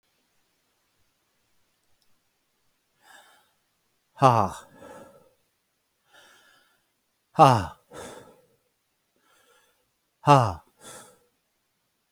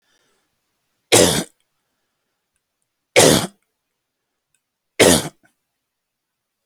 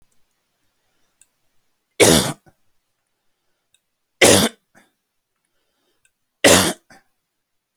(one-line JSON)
{"exhalation_length": "12.1 s", "exhalation_amplitude": 25384, "exhalation_signal_mean_std_ratio": 0.2, "cough_length": "6.7 s", "cough_amplitude": 32768, "cough_signal_mean_std_ratio": 0.27, "three_cough_length": "7.8 s", "three_cough_amplitude": 32768, "three_cough_signal_mean_std_ratio": 0.26, "survey_phase": "alpha (2021-03-01 to 2021-08-12)", "age": "45-64", "gender": "Male", "wearing_mask": "No", "symptom_none": true, "smoker_status": "Never smoked", "respiratory_condition_asthma": false, "respiratory_condition_other": false, "recruitment_source": "REACT", "submission_delay": "1 day", "covid_test_result": "Negative", "covid_test_method": "RT-qPCR"}